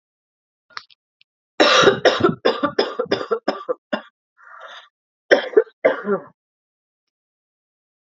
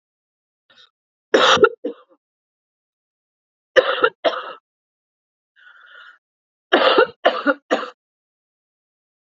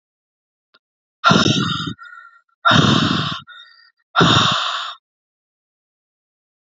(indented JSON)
{
  "cough_length": "8.0 s",
  "cough_amplitude": 29436,
  "cough_signal_mean_std_ratio": 0.36,
  "three_cough_length": "9.3 s",
  "three_cough_amplitude": 28144,
  "three_cough_signal_mean_std_ratio": 0.3,
  "exhalation_length": "6.7 s",
  "exhalation_amplitude": 29444,
  "exhalation_signal_mean_std_ratio": 0.45,
  "survey_phase": "alpha (2021-03-01 to 2021-08-12)",
  "age": "45-64",
  "gender": "Female",
  "wearing_mask": "No",
  "symptom_cough_any": true,
  "symptom_fatigue": true,
  "symptom_headache": true,
  "symptom_change_to_sense_of_smell_or_taste": true,
  "smoker_status": "Never smoked",
  "respiratory_condition_asthma": false,
  "respiratory_condition_other": false,
  "recruitment_source": "Test and Trace",
  "submission_delay": "2 days",
  "covid_test_result": "Positive",
  "covid_test_method": "RT-qPCR"
}